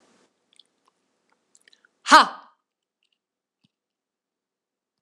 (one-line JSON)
{"exhalation_length": "5.0 s", "exhalation_amplitude": 26028, "exhalation_signal_mean_std_ratio": 0.14, "survey_phase": "beta (2021-08-13 to 2022-03-07)", "age": "65+", "gender": "Female", "wearing_mask": "No", "symptom_headache": true, "symptom_onset": "8 days", "smoker_status": "Never smoked", "respiratory_condition_asthma": false, "respiratory_condition_other": false, "recruitment_source": "REACT", "submission_delay": "0 days", "covid_test_result": "Negative", "covid_test_method": "RT-qPCR", "influenza_a_test_result": "Negative", "influenza_b_test_result": "Negative"}